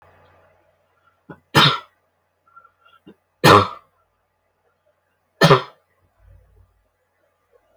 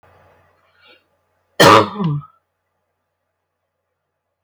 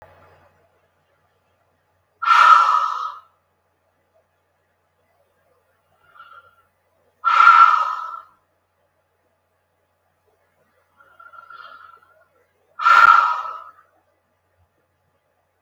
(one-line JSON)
{"three_cough_length": "7.8 s", "three_cough_amplitude": 32768, "three_cough_signal_mean_std_ratio": 0.23, "cough_length": "4.4 s", "cough_amplitude": 32768, "cough_signal_mean_std_ratio": 0.25, "exhalation_length": "15.6 s", "exhalation_amplitude": 32768, "exhalation_signal_mean_std_ratio": 0.29, "survey_phase": "beta (2021-08-13 to 2022-03-07)", "age": "18-44", "gender": "Female", "wearing_mask": "No", "symptom_none": true, "smoker_status": "Current smoker (e-cigarettes or vapes only)", "respiratory_condition_asthma": false, "respiratory_condition_other": true, "recruitment_source": "REACT", "submission_delay": "10 days", "covid_test_result": "Negative", "covid_test_method": "RT-qPCR", "influenza_a_test_result": "Negative", "influenza_b_test_result": "Negative"}